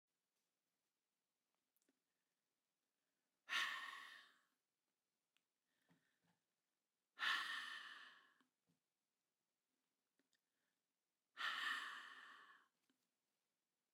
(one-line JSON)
{"exhalation_length": "13.9 s", "exhalation_amplitude": 1175, "exhalation_signal_mean_std_ratio": 0.3, "survey_phase": "beta (2021-08-13 to 2022-03-07)", "age": "45-64", "gender": "Female", "wearing_mask": "Yes", "symptom_none": true, "smoker_status": "Ex-smoker", "respiratory_condition_asthma": false, "respiratory_condition_other": false, "recruitment_source": "REACT", "submission_delay": "1 day", "covid_test_result": "Negative", "covid_test_method": "RT-qPCR", "influenza_a_test_result": "Negative", "influenza_b_test_result": "Negative"}